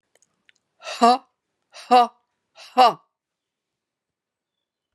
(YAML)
exhalation_length: 4.9 s
exhalation_amplitude: 29257
exhalation_signal_mean_std_ratio: 0.25
survey_phase: beta (2021-08-13 to 2022-03-07)
age: 45-64
gender: Female
wearing_mask: 'No'
symptom_none: true
smoker_status: Never smoked
respiratory_condition_asthma: false
respiratory_condition_other: false
recruitment_source: REACT
submission_delay: 12 days
covid_test_result: Negative
covid_test_method: RT-qPCR
influenza_a_test_result: Negative
influenza_b_test_result: Negative